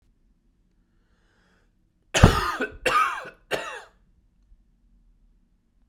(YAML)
three_cough_length: 5.9 s
three_cough_amplitude: 32768
three_cough_signal_mean_std_ratio: 0.28
survey_phase: alpha (2021-03-01 to 2021-08-12)
age: 18-44
gender: Male
wearing_mask: 'No'
symptom_cough_any: true
symptom_new_continuous_cough: true
symptom_fatigue: true
symptom_fever_high_temperature: true
symptom_headache: true
symptom_onset: 5 days
smoker_status: Never smoked
respiratory_condition_asthma: false
respiratory_condition_other: false
recruitment_source: Test and Trace
submission_delay: 2 days
covid_test_result: Positive
covid_test_method: RT-qPCR
covid_ct_value: 30.5
covid_ct_gene: N gene